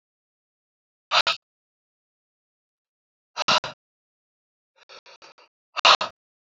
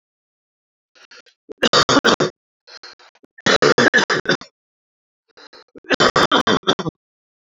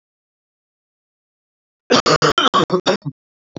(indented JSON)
{
  "exhalation_length": "6.6 s",
  "exhalation_amplitude": 26433,
  "exhalation_signal_mean_std_ratio": 0.21,
  "three_cough_length": "7.5 s",
  "three_cough_amplitude": 29606,
  "three_cough_signal_mean_std_ratio": 0.38,
  "cough_length": "3.6 s",
  "cough_amplitude": 31701,
  "cough_signal_mean_std_ratio": 0.37,
  "survey_phase": "alpha (2021-03-01 to 2021-08-12)",
  "age": "45-64",
  "gender": "Male",
  "wearing_mask": "No",
  "symptom_cough_any": true,
  "symptom_shortness_of_breath": true,
  "symptom_fatigue": true,
  "symptom_headache": true,
  "symptom_change_to_sense_of_smell_or_taste": true,
  "symptom_loss_of_taste": true,
  "symptom_onset": "4 days",
  "smoker_status": "Never smoked",
  "respiratory_condition_asthma": false,
  "respiratory_condition_other": true,
  "recruitment_source": "Test and Trace",
  "submission_delay": "1 day",
  "covid_test_result": "Positive",
  "covid_test_method": "RT-qPCR"
}